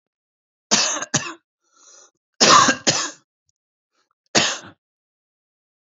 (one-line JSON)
{"cough_length": "6.0 s", "cough_amplitude": 32768, "cough_signal_mean_std_ratio": 0.33, "survey_phase": "beta (2021-08-13 to 2022-03-07)", "age": "45-64", "gender": "Male", "wearing_mask": "No", "symptom_cough_any": true, "symptom_runny_or_blocked_nose": true, "symptom_shortness_of_breath": true, "symptom_sore_throat": true, "symptom_fatigue": true, "symptom_fever_high_temperature": true, "symptom_headache": true, "symptom_change_to_sense_of_smell_or_taste": true, "smoker_status": "Never smoked", "respiratory_condition_asthma": false, "respiratory_condition_other": false, "recruitment_source": "Test and Trace", "submission_delay": "3 days", "covid_test_result": "Negative", "covid_test_method": "RT-qPCR"}